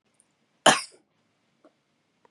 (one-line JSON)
{"cough_length": "2.3 s", "cough_amplitude": 28698, "cough_signal_mean_std_ratio": 0.18, "survey_phase": "beta (2021-08-13 to 2022-03-07)", "age": "45-64", "gender": "Female", "wearing_mask": "No", "symptom_none": true, "symptom_onset": "4 days", "smoker_status": "Ex-smoker", "respiratory_condition_asthma": false, "respiratory_condition_other": false, "recruitment_source": "REACT", "submission_delay": "2 days", "covid_test_result": "Negative", "covid_test_method": "RT-qPCR", "influenza_a_test_result": "Negative", "influenza_b_test_result": "Negative"}